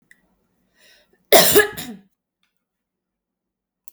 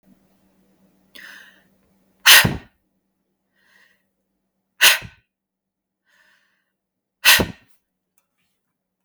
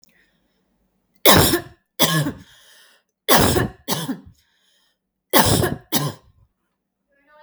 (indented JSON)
{
  "cough_length": "3.9 s",
  "cough_amplitude": 32768,
  "cough_signal_mean_std_ratio": 0.25,
  "exhalation_length": "9.0 s",
  "exhalation_amplitude": 32768,
  "exhalation_signal_mean_std_ratio": 0.21,
  "three_cough_length": "7.4 s",
  "three_cough_amplitude": 32768,
  "three_cough_signal_mean_std_ratio": 0.38,
  "survey_phase": "beta (2021-08-13 to 2022-03-07)",
  "age": "45-64",
  "gender": "Female",
  "wearing_mask": "No",
  "symptom_none": true,
  "smoker_status": "Never smoked",
  "respiratory_condition_asthma": false,
  "respiratory_condition_other": false,
  "recruitment_source": "REACT",
  "submission_delay": "1 day",
  "covid_test_result": "Negative",
  "covid_test_method": "RT-qPCR",
  "influenza_a_test_result": "Negative",
  "influenza_b_test_result": "Negative"
}